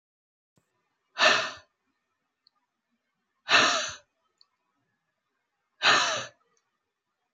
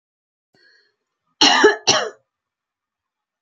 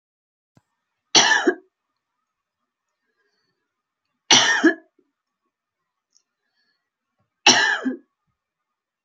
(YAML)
exhalation_length: 7.3 s
exhalation_amplitude: 15763
exhalation_signal_mean_std_ratio: 0.3
cough_length: 3.4 s
cough_amplitude: 29406
cough_signal_mean_std_ratio: 0.31
three_cough_length: 9.0 s
three_cough_amplitude: 32068
three_cough_signal_mean_std_ratio: 0.27
survey_phase: beta (2021-08-13 to 2022-03-07)
age: 65+
gender: Female
wearing_mask: 'No'
symptom_sore_throat: true
smoker_status: Ex-smoker
respiratory_condition_asthma: false
respiratory_condition_other: false
recruitment_source: REACT
submission_delay: 1 day
covid_test_result: Negative
covid_test_method: RT-qPCR
influenza_a_test_result: Negative
influenza_b_test_result: Negative